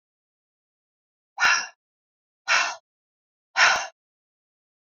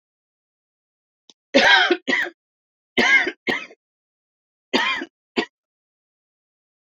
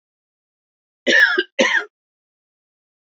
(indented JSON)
{
  "exhalation_length": "4.9 s",
  "exhalation_amplitude": 16796,
  "exhalation_signal_mean_std_ratio": 0.31,
  "three_cough_length": "7.0 s",
  "three_cough_amplitude": 26434,
  "three_cough_signal_mean_std_ratio": 0.35,
  "cough_length": "3.2 s",
  "cough_amplitude": 26594,
  "cough_signal_mean_std_ratio": 0.35,
  "survey_phase": "beta (2021-08-13 to 2022-03-07)",
  "age": "65+",
  "gender": "Female",
  "wearing_mask": "No",
  "symptom_none": true,
  "symptom_onset": "7 days",
  "smoker_status": "Ex-smoker",
  "respiratory_condition_asthma": false,
  "respiratory_condition_other": false,
  "recruitment_source": "REACT",
  "submission_delay": "2 days",
  "covid_test_result": "Negative",
  "covid_test_method": "RT-qPCR"
}